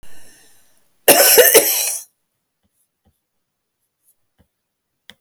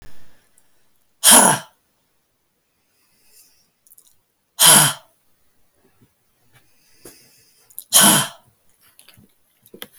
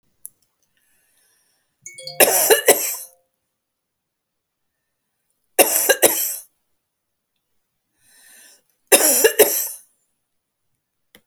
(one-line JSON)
{"cough_length": "5.2 s", "cough_amplitude": 32768, "cough_signal_mean_std_ratio": 0.33, "exhalation_length": "10.0 s", "exhalation_amplitude": 32768, "exhalation_signal_mean_std_ratio": 0.27, "three_cough_length": "11.3 s", "three_cough_amplitude": 32768, "three_cough_signal_mean_std_ratio": 0.31, "survey_phase": "beta (2021-08-13 to 2022-03-07)", "age": "65+", "gender": "Female", "wearing_mask": "No", "symptom_none": true, "symptom_onset": "12 days", "smoker_status": "Ex-smoker", "respiratory_condition_asthma": true, "respiratory_condition_other": false, "recruitment_source": "REACT", "submission_delay": "3 days", "covid_test_result": "Negative", "covid_test_method": "RT-qPCR"}